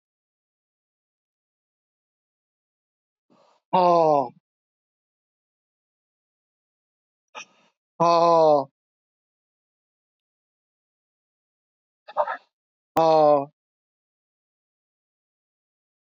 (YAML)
exhalation_length: 16.0 s
exhalation_amplitude: 14620
exhalation_signal_mean_std_ratio: 0.25
survey_phase: alpha (2021-03-01 to 2021-08-12)
age: 65+
gender: Male
wearing_mask: 'No'
symptom_cough_any: true
symptom_onset: 3 days
smoker_status: Never smoked
respiratory_condition_asthma: false
respiratory_condition_other: false
recruitment_source: Test and Trace
submission_delay: 2 days
covid_test_result: Positive
covid_test_method: RT-qPCR
covid_ct_value: 14.8
covid_ct_gene: ORF1ab gene
covid_ct_mean: 15.2
covid_viral_load: 10000000 copies/ml
covid_viral_load_category: High viral load (>1M copies/ml)